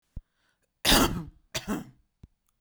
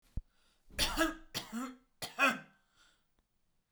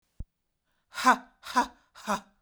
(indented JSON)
{
  "cough_length": "2.6 s",
  "cough_amplitude": 14331,
  "cough_signal_mean_std_ratio": 0.35,
  "three_cough_length": "3.7 s",
  "three_cough_amplitude": 5357,
  "three_cough_signal_mean_std_ratio": 0.38,
  "exhalation_length": "2.4 s",
  "exhalation_amplitude": 14526,
  "exhalation_signal_mean_std_ratio": 0.31,
  "survey_phase": "beta (2021-08-13 to 2022-03-07)",
  "age": "18-44",
  "gender": "Female",
  "wearing_mask": "No",
  "symptom_cough_any": true,
  "smoker_status": "Never smoked",
  "respiratory_condition_asthma": false,
  "respiratory_condition_other": false,
  "recruitment_source": "REACT",
  "submission_delay": "2 days",
  "covid_test_result": "Negative",
  "covid_test_method": "RT-qPCR",
  "influenza_a_test_result": "Negative",
  "influenza_b_test_result": "Negative"
}